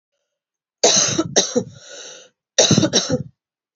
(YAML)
cough_length: 3.8 s
cough_amplitude: 32767
cough_signal_mean_std_ratio: 0.46
survey_phase: beta (2021-08-13 to 2022-03-07)
age: 18-44
gender: Female
wearing_mask: 'No'
symptom_cough_any: true
symptom_runny_or_blocked_nose: true
symptom_sore_throat: true
symptom_fatigue: true
symptom_headache: true
symptom_change_to_sense_of_smell_or_taste: true
symptom_onset: 3 days
smoker_status: Never smoked
respiratory_condition_asthma: false
respiratory_condition_other: false
recruitment_source: Test and Trace
submission_delay: 1 day
covid_test_result: Positive
covid_test_method: RT-qPCR
covid_ct_value: 24.6
covid_ct_gene: ORF1ab gene
covid_ct_mean: 25.1
covid_viral_load: 5700 copies/ml
covid_viral_load_category: Minimal viral load (< 10K copies/ml)